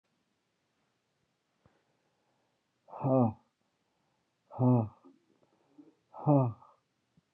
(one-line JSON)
{"exhalation_length": "7.3 s", "exhalation_amplitude": 8064, "exhalation_signal_mean_std_ratio": 0.27, "survey_phase": "beta (2021-08-13 to 2022-03-07)", "age": "45-64", "gender": "Male", "wearing_mask": "No", "symptom_cough_any": true, "symptom_new_continuous_cough": true, "symptom_sore_throat": true, "symptom_fatigue": true, "symptom_headache": true, "symptom_change_to_sense_of_smell_or_taste": true, "symptom_onset": "3 days", "smoker_status": "Never smoked", "respiratory_condition_asthma": false, "respiratory_condition_other": false, "recruitment_source": "Test and Trace", "submission_delay": "1 day", "covid_test_result": "Positive", "covid_test_method": "RT-qPCR", "covid_ct_value": 19.7, "covid_ct_gene": "ORF1ab gene"}